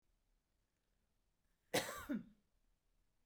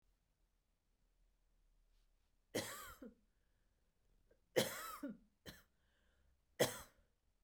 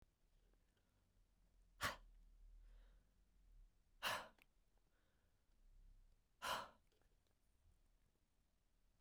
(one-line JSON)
{"cough_length": "3.3 s", "cough_amplitude": 2174, "cough_signal_mean_std_ratio": 0.27, "three_cough_length": "7.4 s", "three_cough_amplitude": 2996, "three_cough_signal_mean_std_ratio": 0.26, "exhalation_length": "9.0 s", "exhalation_amplitude": 1085, "exhalation_signal_mean_std_ratio": 0.32, "survey_phase": "beta (2021-08-13 to 2022-03-07)", "age": "45-64", "gender": "Female", "wearing_mask": "No", "symptom_none": true, "smoker_status": "Never smoked", "respiratory_condition_asthma": true, "respiratory_condition_other": false, "recruitment_source": "REACT", "submission_delay": "1 day", "covid_test_result": "Negative", "covid_test_method": "RT-qPCR", "influenza_a_test_result": "Negative", "influenza_b_test_result": "Negative"}